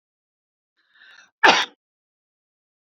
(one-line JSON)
{"cough_length": "2.9 s", "cough_amplitude": 32605, "cough_signal_mean_std_ratio": 0.2, "survey_phase": "beta (2021-08-13 to 2022-03-07)", "age": "65+", "gender": "Female", "wearing_mask": "No", "symptom_none": true, "smoker_status": "Ex-smoker", "respiratory_condition_asthma": true, "respiratory_condition_other": false, "recruitment_source": "REACT", "submission_delay": "2 days", "covid_test_result": "Negative", "covid_test_method": "RT-qPCR"}